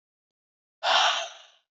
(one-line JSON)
{"exhalation_length": "1.8 s", "exhalation_amplitude": 13356, "exhalation_signal_mean_std_ratio": 0.4, "survey_phase": "beta (2021-08-13 to 2022-03-07)", "age": "45-64", "gender": "Female", "wearing_mask": "No", "symptom_cough_any": true, "symptom_new_continuous_cough": true, "symptom_runny_or_blocked_nose": true, "symptom_sore_throat": true, "symptom_abdominal_pain": true, "symptom_fatigue": true, "symptom_fever_high_temperature": true, "symptom_headache": true, "symptom_change_to_sense_of_smell_or_taste": true, "symptom_other": true, "symptom_onset": "4 days", "smoker_status": "Current smoker (e-cigarettes or vapes only)", "respiratory_condition_asthma": true, "respiratory_condition_other": false, "recruitment_source": "Test and Trace", "submission_delay": "2 days", "covid_test_result": "Positive", "covid_test_method": "RT-qPCR", "covid_ct_value": 22.6, "covid_ct_gene": "ORF1ab gene"}